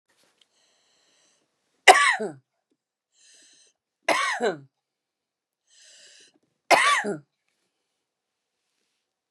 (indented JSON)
{
  "three_cough_length": "9.3 s",
  "three_cough_amplitude": 32768,
  "three_cough_signal_mean_std_ratio": 0.25,
  "survey_phase": "beta (2021-08-13 to 2022-03-07)",
  "age": "45-64",
  "gender": "Female",
  "wearing_mask": "No",
  "symptom_none": true,
  "smoker_status": "Never smoked",
  "respiratory_condition_asthma": true,
  "respiratory_condition_other": false,
  "recruitment_source": "REACT",
  "submission_delay": "2 days",
  "covid_test_result": "Negative",
  "covid_test_method": "RT-qPCR",
  "influenza_a_test_result": "Negative",
  "influenza_b_test_result": "Negative"
}